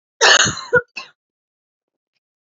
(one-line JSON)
{"cough_length": "2.6 s", "cough_amplitude": 31655, "cough_signal_mean_std_ratio": 0.32, "survey_phase": "alpha (2021-03-01 to 2021-08-12)", "age": "45-64", "gender": "Female", "wearing_mask": "No", "symptom_none": true, "smoker_status": "Never smoked", "respiratory_condition_asthma": true, "respiratory_condition_other": true, "recruitment_source": "REACT", "submission_delay": "9 days", "covid_test_result": "Negative", "covid_test_method": "RT-qPCR"}